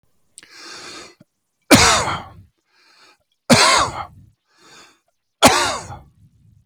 {"three_cough_length": "6.7 s", "three_cough_amplitude": 32768, "three_cough_signal_mean_std_ratio": 0.35, "survey_phase": "alpha (2021-03-01 to 2021-08-12)", "age": "65+", "gender": "Male", "wearing_mask": "No", "symptom_none": true, "smoker_status": "Ex-smoker", "respiratory_condition_asthma": false, "respiratory_condition_other": false, "recruitment_source": "REACT", "submission_delay": "2 days", "covid_test_result": "Negative", "covid_test_method": "RT-qPCR"}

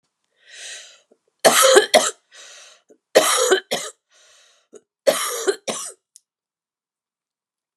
{"three_cough_length": "7.8 s", "three_cough_amplitude": 32768, "three_cough_signal_mean_std_ratio": 0.35, "survey_phase": "alpha (2021-03-01 to 2021-08-12)", "age": "65+", "gender": "Female", "wearing_mask": "No", "symptom_cough_any": true, "symptom_shortness_of_breath": true, "symptom_fatigue": true, "symptom_onset": "12 days", "smoker_status": "Never smoked", "respiratory_condition_asthma": false, "respiratory_condition_other": false, "recruitment_source": "REACT", "submission_delay": "1 day", "covid_test_result": "Negative", "covid_test_method": "RT-qPCR"}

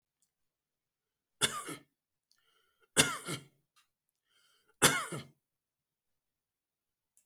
{"three_cough_length": "7.3 s", "three_cough_amplitude": 13765, "three_cough_signal_mean_std_ratio": 0.22, "survey_phase": "beta (2021-08-13 to 2022-03-07)", "age": "45-64", "wearing_mask": "No", "symptom_none": true, "smoker_status": "Never smoked", "respiratory_condition_asthma": true, "respiratory_condition_other": false, "recruitment_source": "REACT", "submission_delay": "1 day", "covid_test_result": "Negative", "covid_test_method": "RT-qPCR", "influenza_a_test_result": "Negative", "influenza_b_test_result": "Negative"}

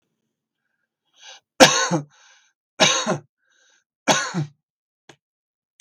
{"three_cough_length": "5.8 s", "three_cough_amplitude": 32768, "three_cough_signal_mean_std_ratio": 0.3, "survey_phase": "beta (2021-08-13 to 2022-03-07)", "age": "65+", "gender": "Male", "wearing_mask": "No", "symptom_none": true, "smoker_status": "Never smoked", "respiratory_condition_asthma": false, "respiratory_condition_other": false, "recruitment_source": "REACT", "submission_delay": "5 days", "covid_test_result": "Negative", "covid_test_method": "RT-qPCR", "influenza_a_test_result": "Negative", "influenza_b_test_result": "Negative"}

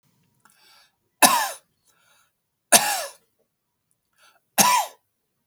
{"three_cough_length": "5.5 s", "three_cough_amplitude": 32638, "three_cough_signal_mean_std_ratio": 0.29, "survey_phase": "beta (2021-08-13 to 2022-03-07)", "age": "45-64", "gender": "Male", "wearing_mask": "No", "symptom_none": true, "smoker_status": "Never smoked", "respiratory_condition_asthma": false, "respiratory_condition_other": false, "recruitment_source": "REACT", "submission_delay": "1 day", "covid_test_result": "Negative", "covid_test_method": "RT-qPCR", "influenza_a_test_result": "Negative", "influenza_b_test_result": "Negative"}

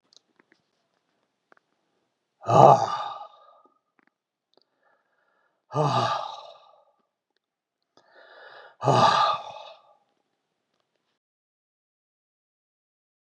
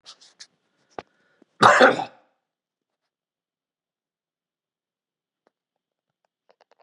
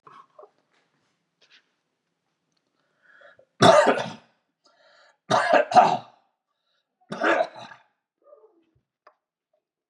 {"exhalation_length": "13.2 s", "exhalation_amplitude": 31621, "exhalation_signal_mean_std_ratio": 0.26, "cough_length": "6.8 s", "cough_amplitude": 32375, "cough_signal_mean_std_ratio": 0.18, "three_cough_length": "9.9 s", "three_cough_amplitude": 24574, "three_cough_signal_mean_std_ratio": 0.28, "survey_phase": "beta (2021-08-13 to 2022-03-07)", "age": "65+", "gender": "Male", "wearing_mask": "No", "symptom_none": true, "smoker_status": "Ex-smoker", "respiratory_condition_asthma": false, "respiratory_condition_other": false, "recruitment_source": "REACT", "submission_delay": "3 days", "covid_test_result": "Negative", "covid_test_method": "RT-qPCR", "influenza_a_test_result": "Negative", "influenza_b_test_result": "Negative"}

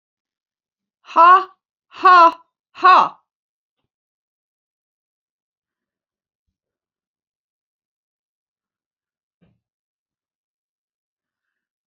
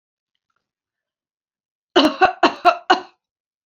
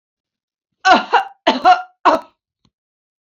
{"exhalation_length": "11.9 s", "exhalation_amplitude": 28823, "exhalation_signal_mean_std_ratio": 0.21, "cough_length": "3.7 s", "cough_amplitude": 28491, "cough_signal_mean_std_ratio": 0.3, "three_cough_length": "3.3 s", "three_cough_amplitude": 28401, "three_cough_signal_mean_std_ratio": 0.36, "survey_phase": "beta (2021-08-13 to 2022-03-07)", "age": "65+", "gender": "Female", "wearing_mask": "No", "symptom_none": true, "smoker_status": "Ex-smoker", "respiratory_condition_asthma": false, "respiratory_condition_other": false, "recruitment_source": "REACT", "submission_delay": "0 days", "covid_test_result": "Negative", "covid_test_method": "RT-qPCR", "influenza_a_test_result": "Negative", "influenza_b_test_result": "Negative"}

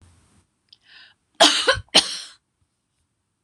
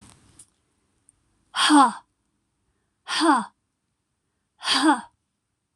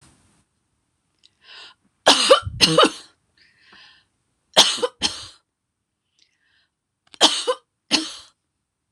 {"cough_length": "3.4 s", "cough_amplitude": 26028, "cough_signal_mean_std_ratio": 0.28, "exhalation_length": "5.8 s", "exhalation_amplitude": 20167, "exhalation_signal_mean_std_ratio": 0.34, "three_cough_length": "8.9 s", "three_cough_amplitude": 26028, "three_cough_signal_mean_std_ratio": 0.3, "survey_phase": "beta (2021-08-13 to 2022-03-07)", "age": "65+", "gender": "Female", "wearing_mask": "No", "symptom_runny_or_blocked_nose": true, "symptom_sore_throat": true, "symptom_fatigue": true, "symptom_headache": true, "smoker_status": "Never smoked", "respiratory_condition_asthma": true, "respiratory_condition_other": false, "recruitment_source": "Test and Trace", "submission_delay": "0 days", "covid_test_result": "Negative", "covid_test_method": "LFT"}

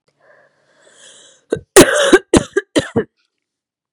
{"cough_length": "3.9 s", "cough_amplitude": 32768, "cough_signal_mean_std_ratio": 0.32, "survey_phase": "beta (2021-08-13 to 2022-03-07)", "age": "18-44", "gender": "Female", "wearing_mask": "No", "symptom_cough_any": true, "symptom_runny_or_blocked_nose": true, "symptom_shortness_of_breath": true, "symptom_sore_throat": true, "symptom_abdominal_pain": true, "symptom_fatigue": true, "symptom_headache": true, "symptom_change_to_sense_of_smell_or_taste": true, "symptom_onset": "6 days", "smoker_status": "Ex-smoker", "respiratory_condition_asthma": false, "respiratory_condition_other": false, "recruitment_source": "Test and Trace", "submission_delay": "2 days", "covid_test_result": "Positive", "covid_test_method": "RT-qPCR", "covid_ct_value": 18.7, "covid_ct_gene": "N gene", "covid_ct_mean": 19.6, "covid_viral_load": "390000 copies/ml", "covid_viral_load_category": "Low viral load (10K-1M copies/ml)"}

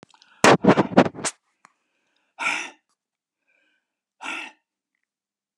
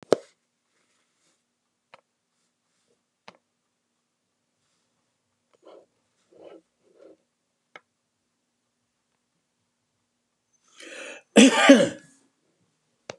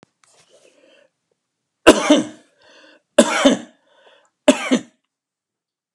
{"exhalation_length": "5.6 s", "exhalation_amplitude": 32768, "exhalation_signal_mean_std_ratio": 0.26, "cough_length": "13.2 s", "cough_amplitude": 30925, "cough_signal_mean_std_ratio": 0.16, "three_cough_length": "5.9 s", "three_cough_amplitude": 32768, "three_cough_signal_mean_std_ratio": 0.28, "survey_phase": "beta (2021-08-13 to 2022-03-07)", "age": "65+", "gender": "Male", "wearing_mask": "No", "symptom_none": true, "smoker_status": "Never smoked", "respiratory_condition_asthma": false, "respiratory_condition_other": false, "recruitment_source": "REACT", "submission_delay": "2 days", "covid_test_result": "Negative", "covid_test_method": "RT-qPCR"}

